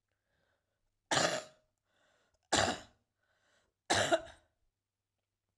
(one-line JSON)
{"three_cough_length": "5.6 s", "three_cough_amplitude": 8059, "three_cough_signal_mean_std_ratio": 0.3, "survey_phase": "alpha (2021-03-01 to 2021-08-12)", "age": "45-64", "gender": "Female", "wearing_mask": "No", "symptom_cough_any": true, "symptom_fatigue": true, "symptom_change_to_sense_of_smell_or_taste": true, "smoker_status": "Never smoked", "respiratory_condition_asthma": true, "respiratory_condition_other": false, "recruitment_source": "Test and Trace", "submission_delay": "1 day", "covid_test_result": "Positive", "covid_test_method": "RT-qPCR"}